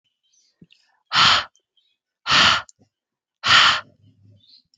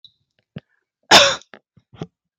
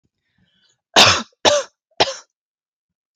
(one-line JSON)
{"exhalation_length": "4.8 s", "exhalation_amplitude": 27127, "exhalation_signal_mean_std_ratio": 0.37, "cough_length": "2.4 s", "cough_amplitude": 32768, "cough_signal_mean_std_ratio": 0.25, "three_cough_length": "3.2 s", "three_cough_amplitude": 32768, "three_cough_signal_mean_std_ratio": 0.31, "survey_phase": "alpha (2021-03-01 to 2021-08-12)", "age": "18-44", "gender": "Female", "wearing_mask": "No", "symptom_fatigue": true, "smoker_status": "Never smoked", "respiratory_condition_asthma": false, "respiratory_condition_other": false, "recruitment_source": "REACT", "submission_delay": "1 day", "covid_test_result": "Negative", "covid_test_method": "RT-qPCR"}